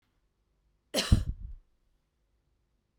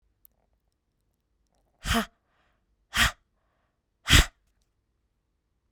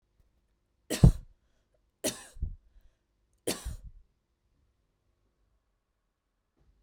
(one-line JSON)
{"cough_length": "3.0 s", "cough_amplitude": 10715, "cough_signal_mean_std_ratio": 0.24, "exhalation_length": "5.7 s", "exhalation_amplitude": 22682, "exhalation_signal_mean_std_ratio": 0.21, "three_cough_length": "6.8 s", "three_cough_amplitude": 15734, "three_cough_signal_mean_std_ratio": 0.17, "survey_phase": "beta (2021-08-13 to 2022-03-07)", "age": "18-44", "gender": "Female", "wearing_mask": "No", "symptom_none": true, "smoker_status": "Ex-smoker", "respiratory_condition_asthma": true, "respiratory_condition_other": false, "recruitment_source": "REACT", "submission_delay": "2 days", "covid_test_result": "Negative", "covid_test_method": "RT-qPCR", "influenza_a_test_result": "Unknown/Void", "influenza_b_test_result": "Unknown/Void"}